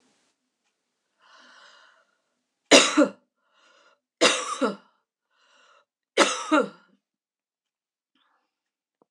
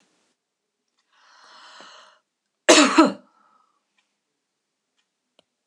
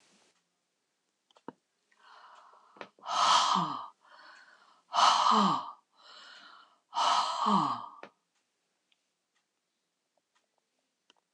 {"three_cough_length": "9.1 s", "three_cough_amplitude": 26027, "three_cough_signal_mean_std_ratio": 0.25, "cough_length": "5.7 s", "cough_amplitude": 26027, "cough_signal_mean_std_ratio": 0.21, "exhalation_length": "11.3 s", "exhalation_amplitude": 8623, "exhalation_signal_mean_std_ratio": 0.37, "survey_phase": "beta (2021-08-13 to 2022-03-07)", "age": "65+", "gender": "Female", "wearing_mask": "No", "symptom_none": true, "smoker_status": "Never smoked", "respiratory_condition_asthma": true, "respiratory_condition_other": false, "recruitment_source": "REACT", "submission_delay": "1 day", "covid_test_result": "Negative", "covid_test_method": "RT-qPCR"}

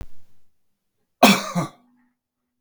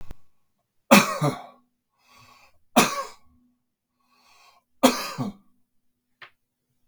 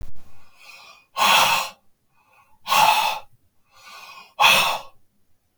{"cough_length": "2.6 s", "cough_amplitude": 32767, "cough_signal_mean_std_ratio": 0.3, "three_cough_length": "6.9 s", "three_cough_amplitude": 32768, "three_cough_signal_mean_std_ratio": 0.27, "exhalation_length": "5.6 s", "exhalation_amplitude": 27792, "exhalation_signal_mean_std_ratio": 0.48, "survey_phase": "beta (2021-08-13 to 2022-03-07)", "age": "45-64", "gender": "Male", "wearing_mask": "No", "symptom_cough_any": true, "symptom_sore_throat": true, "smoker_status": "Ex-smoker", "respiratory_condition_asthma": false, "respiratory_condition_other": false, "recruitment_source": "REACT", "submission_delay": "2 days", "covid_test_result": "Negative", "covid_test_method": "RT-qPCR", "influenza_a_test_result": "Negative", "influenza_b_test_result": "Negative"}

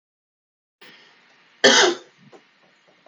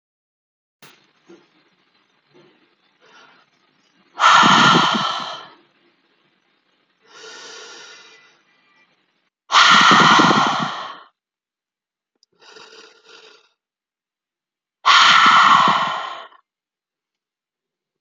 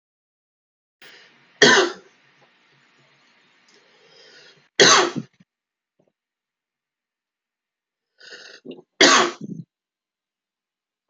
{"cough_length": "3.1 s", "cough_amplitude": 28678, "cough_signal_mean_std_ratio": 0.26, "exhalation_length": "18.0 s", "exhalation_amplitude": 32768, "exhalation_signal_mean_std_ratio": 0.36, "three_cough_length": "11.1 s", "three_cough_amplitude": 32767, "three_cough_signal_mean_std_ratio": 0.24, "survey_phase": "alpha (2021-03-01 to 2021-08-12)", "age": "18-44", "gender": "Male", "wearing_mask": "No", "symptom_cough_any": true, "symptom_fatigue": true, "symptom_change_to_sense_of_smell_or_taste": true, "symptom_loss_of_taste": true, "symptom_onset": "8 days", "smoker_status": "Ex-smoker", "respiratory_condition_asthma": false, "respiratory_condition_other": false, "recruitment_source": "Test and Trace", "submission_delay": "4 days", "covid_test_result": "Positive", "covid_test_method": "RT-qPCR", "covid_ct_value": 16.1, "covid_ct_gene": "ORF1ab gene", "covid_ct_mean": 16.6, "covid_viral_load": "3500000 copies/ml", "covid_viral_load_category": "High viral load (>1M copies/ml)"}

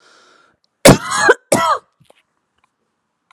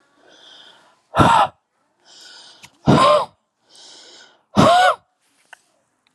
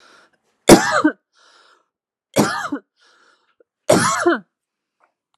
{"cough_length": "3.3 s", "cough_amplitude": 32768, "cough_signal_mean_std_ratio": 0.32, "exhalation_length": "6.1 s", "exhalation_amplitude": 32463, "exhalation_signal_mean_std_ratio": 0.37, "three_cough_length": "5.4 s", "three_cough_amplitude": 32768, "three_cough_signal_mean_std_ratio": 0.33, "survey_phase": "beta (2021-08-13 to 2022-03-07)", "age": "18-44", "gender": "Female", "wearing_mask": "No", "symptom_none": true, "smoker_status": "Never smoked", "respiratory_condition_asthma": false, "respiratory_condition_other": false, "recruitment_source": "Test and Trace", "submission_delay": "1 day", "covid_test_result": "Positive", "covid_test_method": "ePCR"}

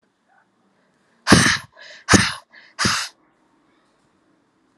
{"exhalation_length": "4.8 s", "exhalation_amplitude": 32768, "exhalation_signal_mean_std_ratio": 0.3, "survey_phase": "alpha (2021-03-01 to 2021-08-12)", "age": "18-44", "gender": "Female", "wearing_mask": "No", "symptom_cough_any": true, "symptom_diarrhoea": true, "symptom_fatigue": true, "symptom_headache": true, "symptom_change_to_sense_of_smell_or_taste": true, "symptom_loss_of_taste": true, "symptom_onset": "2 days", "smoker_status": "Ex-smoker", "respiratory_condition_asthma": false, "respiratory_condition_other": false, "recruitment_source": "Test and Trace", "submission_delay": "2 days", "covid_test_result": "Positive", "covid_test_method": "RT-qPCR", "covid_ct_value": 20.6, "covid_ct_gene": "ORF1ab gene"}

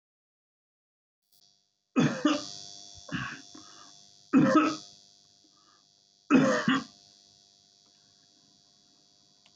{"three_cough_length": "9.6 s", "three_cough_amplitude": 10052, "three_cough_signal_mean_std_ratio": 0.33, "survey_phase": "beta (2021-08-13 to 2022-03-07)", "age": "65+", "gender": "Male", "wearing_mask": "No", "symptom_fatigue": true, "smoker_status": "Never smoked", "respiratory_condition_asthma": false, "respiratory_condition_other": false, "recruitment_source": "REACT", "submission_delay": "2 days", "covid_test_result": "Negative", "covid_test_method": "RT-qPCR"}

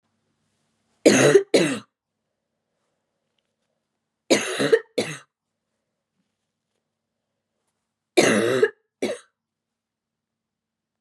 {"three_cough_length": "11.0 s", "three_cough_amplitude": 27685, "three_cough_signal_mean_std_ratio": 0.29, "survey_phase": "beta (2021-08-13 to 2022-03-07)", "age": "18-44", "gender": "Female", "wearing_mask": "Yes", "symptom_cough_any": true, "symptom_runny_or_blocked_nose": true, "symptom_sore_throat": true, "symptom_onset": "7 days", "smoker_status": "Never smoked", "respiratory_condition_asthma": false, "respiratory_condition_other": false, "recruitment_source": "Test and Trace", "submission_delay": "2 days", "covid_test_result": "Positive", "covid_test_method": "RT-qPCR", "covid_ct_value": 25.3, "covid_ct_gene": "ORF1ab gene"}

